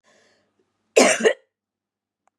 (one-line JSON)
{"cough_length": "2.4 s", "cough_amplitude": 31348, "cough_signal_mean_std_ratio": 0.28, "survey_phase": "beta (2021-08-13 to 2022-03-07)", "age": "45-64", "gender": "Female", "wearing_mask": "No", "symptom_none": true, "smoker_status": "Never smoked", "respiratory_condition_asthma": false, "respiratory_condition_other": false, "recruitment_source": "REACT", "submission_delay": "2 days", "covid_test_result": "Negative", "covid_test_method": "RT-qPCR", "influenza_a_test_result": "Negative", "influenza_b_test_result": "Negative"}